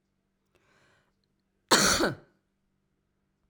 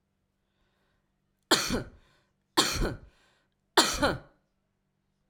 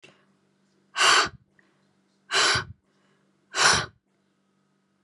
{"cough_length": "3.5 s", "cough_amplitude": 16861, "cough_signal_mean_std_ratio": 0.27, "three_cough_length": "5.3 s", "three_cough_amplitude": 17085, "three_cough_signal_mean_std_ratio": 0.32, "exhalation_length": "5.0 s", "exhalation_amplitude": 21001, "exhalation_signal_mean_std_ratio": 0.35, "survey_phase": "alpha (2021-03-01 to 2021-08-12)", "age": "45-64", "gender": "Female", "wearing_mask": "No", "symptom_none": true, "smoker_status": "Never smoked", "respiratory_condition_asthma": false, "respiratory_condition_other": false, "recruitment_source": "REACT", "submission_delay": "2 days", "covid_test_result": "Negative", "covid_test_method": "RT-qPCR"}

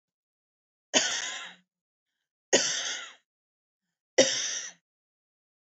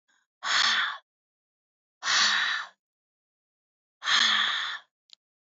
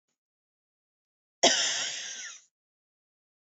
{"three_cough_length": "5.7 s", "three_cough_amplitude": 15605, "three_cough_signal_mean_std_ratio": 0.33, "exhalation_length": "5.5 s", "exhalation_amplitude": 11262, "exhalation_signal_mean_std_ratio": 0.47, "cough_length": "3.5 s", "cough_amplitude": 13475, "cough_signal_mean_std_ratio": 0.31, "survey_phase": "beta (2021-08-13 to 2022-03-07)", "age": "45-64", "gender": "Female", "wearing_mask": "No", "symptom_runny_or_blocked_nose": true, "symptom_fatigue": true, "symptom_headache": true, "smoker_status": "Never smoked", "respiratory_condition_asthma": false, "respiratory_condition_other": false, "recruitment_source": "Test and Trace", "submission_delay": "1 day", "covid_test_result": "Negative", "covid_test_method": "RT-qPCR"}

